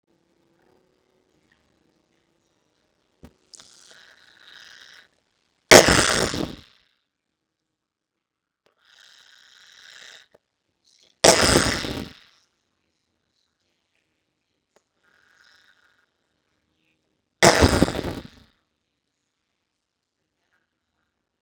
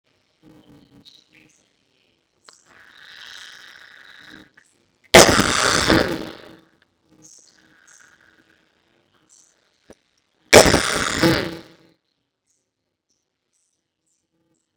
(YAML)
three_cough_length: 21.4 s
three_cough_amplitude: 32768
three_cough_signal_mean_std_ratio: 0.16
cough_length: 14.8 s
cough_amplitude: 32768
cough_signal_mean_std_ratio: 0.2
survey_phase: beta (2021-08-13 to 2022-03-07)
age: 45-64
gender: Female
wearing_mask: 'No'
symptom_none: true
smoker_status: Ex-smoker
respiratory_condition_asthma: false
respiratory_condition_other: false
recruitment_source: REACT
submission_delay: 2 days
covid_test_result: Negative
covid_test_method: RT-qPCR
influenza_a_test_result: Unknown/Void
influenza_b_test_result: Unknown/Void